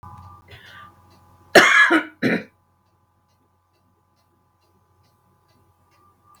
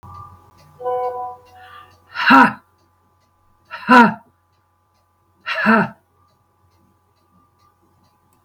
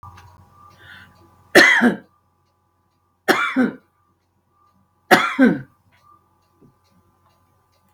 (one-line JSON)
{"cough_length": "6.4 s", "cough_amplitude": 32768, "cough_signal_mean_std_ratio": 0.26, "exhalation_length": "8.4 s", "exhalation_amplitude": 32768, "exhalation_signal_mean_std_ratio": 0.3, "three_cough_length": "7.9 s", "three_cough_amplitude": 32768, "three_cough_signal_mean_std_ratio": 0.3, "survey_phase": "beta (2021-08-13 to 2022-03-07)", "age": "65+", "gender": "Female", "wearing_mask": "No", "symptom_runny_or_blocked_nose": true, "symptom_headache": true, "smoker_status": "Ex-smoker", "respiratory_condition_asthma": false, "respiratory_condition_other": false, "recruitment_source": "REACT", "submission_delay": "8 days", "covid_test_result": "Negative", "covid_test_method": "RT-qPCR", "influenza_a_test_result": "Negative", "influenza_b_test_result": "Negative"}